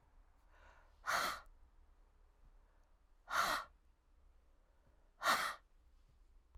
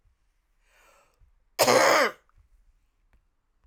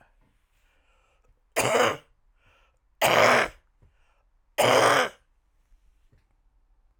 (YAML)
exhalation_length: 6.6 s
exhalation_amplitude: 2760
exhalation_signal_mean_std_ratio: 0.36
cough_length: 3.7 s
cough_amplitude: 22588
cough_signal_mean_std_ratio: 0.3
three_cough_length: 7.0 s
three_cough_amplitude: 22405
three_cough_signal_mean_std_ratio: 0.35
survey_phase: alpha (2021-03-01 to 2021-08-12)
age: 45-64
gender: Female
wearing_mask: 'No'
symptom_cough_any: true
symptom_fatigue: true
symptom_headache: true
symptom_onset: 12 days
smoker_status: Ex-smoker
respiratory_condition_asthma: true
respiratory_condition_other: false
recruitment_source: REACT
submission_delay: 3 days
covid_test_result: Negative
covid_test_method: RT-qPCR